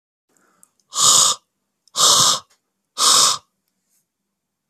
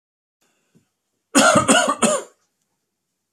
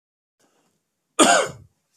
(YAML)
exhalation_length: 4.7 s
exhalation_amplitude: 32768
exhalation_signal_mean_std_ratio: 0.41
three_cough_length: 3.3 s
three_cough_amplitude: 30050
three_cough_signal_mean_std_ratio: 0.39
cough_length: 2.0 s
cough_amplitude: 28812
cough_signal_mean_std_ratio: 0.3
survey_phase: beta (2021-08-13 to 2022-03-07)
age: 18-44
gender: Male
wearing_mask: 'No'
symptom_sore_throat: true
symptom_onset: 6 days
smoker_status: Never smoked
respiratory_condition_asthma: false
respiratory_condition_other: false
recruitment_source: REACT
submission_delay: 3 days
covid_test_result: Negative
covid_test_method: RT-qPCR